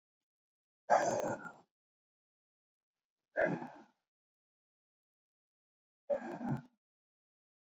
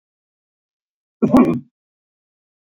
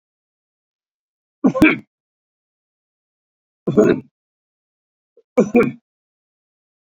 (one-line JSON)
{"exhalation_length": "7.7 s", "exhalation_amplitude": 4743, "exhalation_signal_mean_std_ratio": 0.29, "cough_length": "2.7 s", "cough_amplitude": 26440, "cough_signal_mean_std_ratio": 0.27, "three_cough_length": "6.8 s", "three_cough_amplitude": 29224, "three_cough_signal_mean_std_ratio": 0.26, "survey_phase": "beta (2021-08-13 to 2022-03-07)", "age": "65+", "gender": "Male", "wearing_mask": "No", "symptom_none": true, "smoker_status": "Ex-smoker", "respiratory_condition_asthma": false, "respiratory_condition_other": false, "recruitment_source": "REACT", "submission_delay": "1 day", "covid_test_result": "Negative", "covid_test_method": "RT-qPCR", "influenza_a_test_result": "Negative", "influenza_b_test_result": "Negative"}